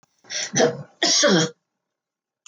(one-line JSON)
{"cough_length": "2.5 s", "cough_amplitude": 19746, "cough_signal_mean_std_ratio": 0.48, "survey_phase": "beta (2021-08-13 to 2022-03-07)", "age": "65+", "gender": "Female", "wearing_mask": "No", "symptom_none": true, "smoker_status": "Ex-smoker", "respiratory_condition_asthma": false, "respiratory_condition_other": false, "recruitment_source": "REACT", "submission_delay": "3 days", "covid_test_result": "Negative", "covid_test_method": "RT-qPCR"}